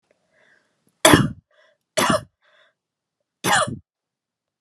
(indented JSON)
{
  "three_cough_length": "4.6 s",
  "three_cough_amplitude": 32768,
  "three_cough_signal_mean_std_ratio": 0.29,
  "survey_phase": "alpha (2021-03-01 to 2021-08-12)",
  "age": "45-64",
  "gender": "Female",
  "wearing_mask": "No",
  "symptom_none": true,
  "smoker_status": "Never smoked",
  "respiratory_condition_asthma": false,
  "respiratory_condition_other": false,
  "recruitment_source": "REACT",
  "submission_delay": "5 days",
  "covid_test_result": "Negative",
  "covid_test_method": "RT-qPCR"
}